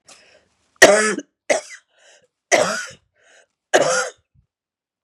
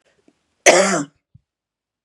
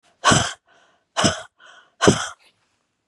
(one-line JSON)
{"three_cough_length": "5.0 s", "three_cough_amplitude": 32768, "three_cough_signal_mean_std_ratio": 0.34, "cough_length": "2.0 s", "cough_amplitude": 32768, "cough_signal_mean_std_ratio": 0.32, "exhalation_length": "3.1 s", "exhalation_amplitude": 32731, "exhalation_signal_mean_std_ratio": 0.35, "survey_phase": "beta (2021-08-13 to 2022-03-07)", "age": "65+", "gender": "Female", "wearing_mask": "No", "symptom_cough_any": true, "symptom_runny_or_blocked_nose": true, "symptom_sore_throat": true, "symptom_fatigue": true, "symptom_headache": true, "symptom_other": true, "symptom_onset": "5 days", "smoker_status": "Never smoked", "respiratory_condition_asthma": false, "respiratory_condition_other": false, "recruitment_source": "Test and Trace", "submission_delay": "1 day", "covid_test_result": "Negative", "covid_test_method": "ePCR"}